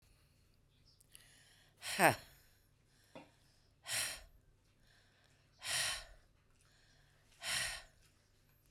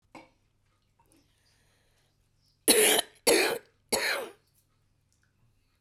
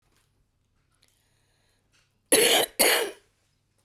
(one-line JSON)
{"exhalation_length": "8.7 s", "exhalation_amplitude": 7156, "exhalation_signal_mean_std_ratio": 0.29, "three_cough_length": "5.8 s", "three_cough_amplitude": 15080, "three_cough_signal_mean_std_ratio": 0.32, "cough_length": "3.8 s", "cough_amplitude": 25391, "cough_signal_mean_std_ratio": 0.33, "survey_phase": "beta (2021-08-13 to 2022-03-07)", "age": "45-64", "gender": "Female", "wearing_mask": "No", "symptom_cough_any": true, "symptom_fatigue": true, "symptom_headache": true, "symptom_onset": "6 days", "smoker_status": "Current smoker (11 or more cigarettes per day)", "respiratory_condition_asthma": false, "respiratory_condition_other": false, "recruitment_source": "REACT", "submission_delay": "0 days", "covid_test_result": "Negative", "covid_test_method": "RT-qPCR"}